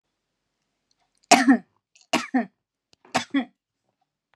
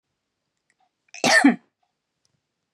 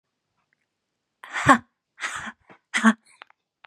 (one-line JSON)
{"three_cough_length": "4.4 s", "three_cough_amplitude": 31398, "three_cough_signal_mean_std_ratio": 0.27, "cough_length": "2.7 s", "cough_amplitude": 21204, "cough_signal_mean_std_ratio": 0.27, "exhalation_length": "3.7 s", "exhalation_amplitude": 30546, "exhalation_signal_mean_std_ratio": 0.26, "survey_phase": "beta (2021-08-13 to 2022-03-07)", "age": "18-44", "gender": "Female", "wearing_mask": "No", "symptom_cough_any": true, "symptom_runny_or_blocked_nose": true, "smoker_status": "Never smoked", "respiratory_condition_asthma": false, "respiratory_condition_other": false, "recruitment_source": "REACT", "submission_delay": "1 day", "covid_test_result": "Negative", "covid_test_method": "RT-qPCR"}